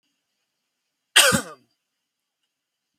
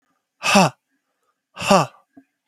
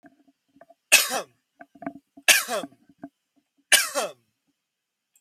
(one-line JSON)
{"cough_length": "3.0 s", "cough_amplitude": 31354, "cough_signal_mean_std_ratio": 0.22, "exhalation_length": "2.5 s", "exhalation_amplitude": 31489, "exhalation_signal_mean_std_ratio": 0.34, "three_cough_length": "5.2 s", "three_cough_amplitude": 30241, "three_cough_signal_mean_std_ratio": 0.28, "survey_phase": "beta (2021-08-13 to 2022-03-07)", "age": "18-44", "gender": "Male", "wearing_mask": "No", "symptom_cough_any": true, "smoker_status": "Current smoker (1 to 10 cigarettes per day)", "respiratory_condition_asthma": true, "respiratory_condition_other": false, "recruitment_source": "REACT", "submission_delay": "1 day", "covid_test_result": "Negative", "covid_test_method": "RT-qPCR", "covid_ct_value": 42.0, "covid_ct_gene": "N gene"}